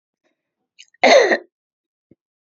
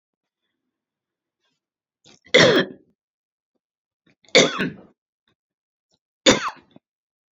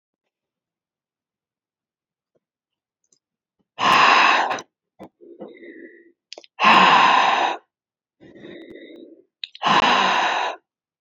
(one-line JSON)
{"cough_length": "2.5 s", "cough_amplitude": 32230, "cough_signal_mean_std_ratio": 0.3, "three_cough_length": "7.3 s", "three_cough_amplitude": 32156, "three_cough_signal_mean_std_ratio": 0.25, "exhalation_length": "11.0 s", "exhalation_amplitude": 26051, "exhalation_signal_mean_std_ratio": 0.41, "survey_phase": "alpha (2021-03-01 to 2021-08-12)", "age": "65+", "gender": "Female", "wearing_mask": "No", "symptom_none": true, "smoker_status": "Never smoked", "respiratory_condition_asthma": true, "respiratory_condition_other": false, "recruitment_source": "REACT", "submission_delay": "1 day", "covid_test_result": "Negative", "covid_test_method": "RT-qPCR"}